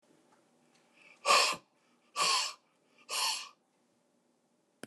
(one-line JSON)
{"exhalation_length": "4.9 s", "exhalation_amplitude": 8166, "exhalation_signal_mean_std_ratio": 0.35, "survey_phase": "alpha (2021-03-01 to 2021-08-12)", "age": "65+", "gender": "Male", "wearing_mask": "No", "symptom_none": true, "smoker_status": "Never smoked", "respiratory_condition_asthma": false, "respiratory_condition_other": false, "recruitment_source": "REACT", "submission_delay": "2 days", "covid_test_result": "Negative", "covid_test_method": "RT-qPCR"}